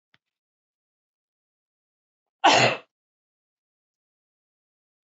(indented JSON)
{
  "cough_length": "5.0 s",
  "cough_amplitude": 18681,
  "cough_signal_mean_std_ratio": 0.19,
  "survey_phase": "beta (2021-08-13 to 2022-03-07)",
  "age": "45-64",
  "gender": "Female",
  "wearing_mask": "No",
  "symptom_none": true,
  "smoker_status": "Current smoker (e-cigarettes or vapes only)",
  "respiratory_condition_asthma": false,
  "respiratory_condition_other": false,
  "recruitment_source": "Test and Trace",
  "submission_delay": "-1 day",
  "covid_test_result": "Negative",
  "covid_test_method": "LFT"
}